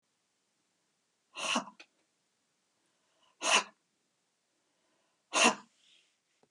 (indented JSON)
{
  "exhalation_length": "6.5 s",
  "exhalation_amplitude": 11092,
  "exhalation_signal_mean_std_ratio": 0.24,
  "survey_phase": "beta (2021-08-13 to 2022-03-07)",
  "age": "45-64",
  "gender": "Female",
  "wearing_mask": "No",
  "symptom_none": true,
  "smoker_status": "Ex-smoker",
  "respiratory_condition_asthma": false,
  "respiratory_condition_other": false,
  "recruitment_source": "REACT",
  "submission_delay": "1 day",
  "covid_test_result": "Negative",
  "covid_test_method": "RT-qPCR",
  "influenza_a_test_result": "Negative",
  "influenza_b_test_result": "Negative"
}